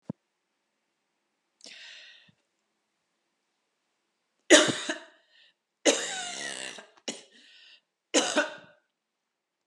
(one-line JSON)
{"three_cough_length": "9.7 s", "three_cough_amplitude": 30149, "three_cough_signal_mean_std_ratio": 0.25, "survey_phase": "alpha (2021-03-01 to 2021-08-12)", "age": "45-64", "gender": "Female", "wearing_mask": "No", "symptom_none": true, "smoker_status": "Never smoked", "respiratory_condition_asthma": false, "respiratory_condition_other": false, "recruitment_source": "REACT", "submission_delay": "3 days", "covid_test_result": "Negative", "covid_test_method": "RT-qPCR"}